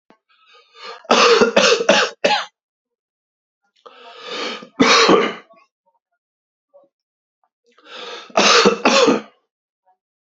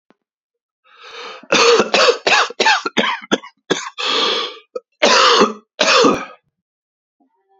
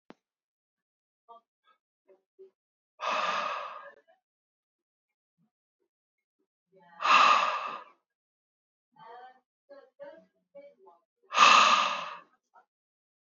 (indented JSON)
{
  "three_cough_length": "10.2 s",
  "three_cough_amplitude": 32768,
  "three_cough_signal_mean_std_ratio": 0.42,
  "cough_length": "7.6 s",
  "cough_amplitude": 32767,
  "cough_signal_mean_std_ratio": 0.52,
  "exhalation_length": "13.2 s",
  "exhalation_amplitude": 15204,
  "exhalation_signal_mean_std_ratio": 0.29,
  "survey_phase": "beta (2021-08-13 to 2022-03-07)",
  "age": "45-64",
  "gender": "Male",
  "wearing_mask": "No",
  "symptom_cough_any": true,
  "symptom_sore_throat": true,
  "symptom_fatigue": true,
  "symptom_fever_high_temperature": true,
  "symptom_headache": true,
  "symptom_onset": "2 days",
  "smoker_status": "Never smoked",
  "respiratory_condition_asthma": false,
  "respiratory_condition_other": false,
  "recruitment_source": "Test and Trace",
  "submission_delay": "1 day",
  "covid_test_result": "Positive",
  "covid_test_method": "RT-qPCR"
}